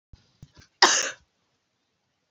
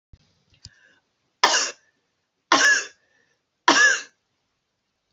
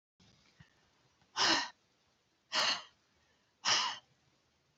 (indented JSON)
{
  "cough_length": "2.3 s",
  "cough_amplitude": 29090,
  "cough_signal_mean_std_ratio": 0.24,
  "three_cough_length": "5.1 s",
  "three_cough_amplitude": 32767,
  "three_cough_signal_mean_std_ratio": 0.33,
  "exhalation_length": "4.8 s",
  "exhalation_amplitude": 5086,
  "exhalation_signal_mean_std_ratio": 0.35,
  "survey_phase": "alpha (2021-03-01 to 2021-08-12)",
  "age": "45-64",
  "gender": "Female",
  "wearing_mask": "No",
  "symptom_none": true,
  "smoker_status": "Never smoked",
  "respiratory_condition_asthma": false,
  "respiratory_condition_other": false,
  "recruitment_source": "REACT",
  "submission_delay": "3 days",
  "covid_test_result": "Negative",
  "covid_test_method": "RT-qPCR"
}